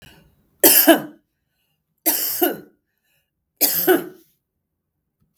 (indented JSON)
{
  "three_cough_length": "5.4 s",
  "three_cough_amplitude": 32767,
  "three_cough_signal_mean_std_ratio": 0.35,
  "survey_phase": "beta (2021-08-13 to 2022-03-07)",
  "age": "45-64",
  "gender": "Female",
  "wearing_mask": "No",
  "symptom_none": true,
  "smoker_status": "Ex-smoker",
  "respiratory_condition_asthma": false,
  "respiratory_condition_other": false,
  "recruitment_source": "REACT",
  "submission_delay": "0 days",
  "covid_test_result": "Negative",
  "covid_test_method": "RT-qPCR",
  "influenza_a_test_result": "Unknown/Void",
  "influenza_b_test_result": "Unknown/Void"
}